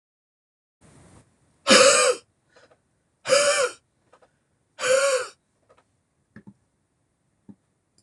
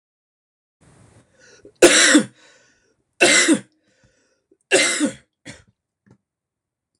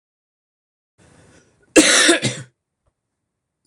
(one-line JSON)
{"exhalation_length": "8.0 s", "exhalation_amplitude": 25247, "exhalation_signal_mean_std_ratio": 0.33, "three_cough_length": "7.0 s", "three_cough_amplitude": 26028, "three_cough_signal_mean_std_ratio": 0.32, "cough_length": "3.7 s", "cough_amplitude": 26028, "cough_signal_mean_std_ratio": 0.3, "survey_phase": "beta (2021-08-13 to 2022-03-07)", "age": "45-64", "gender": "Male", "wearing_mask": "No", "symptom_cough_any": true, "symptom_sore_throat": true, "symptom_change_to_sense_of_smell_or_taste": true, "symptom_loss_of_taste": true, "symptom_onset": "4 days", "smoker_status": "Ex-smoker", "respiratory_condition_asthma": false, "respiratory_condition_other": false, "recruitment_source": "Test and Trace", "submission_delay": "2 days", "covid_test_result": "Positive", "covid_test_method": "RT-qPCR"}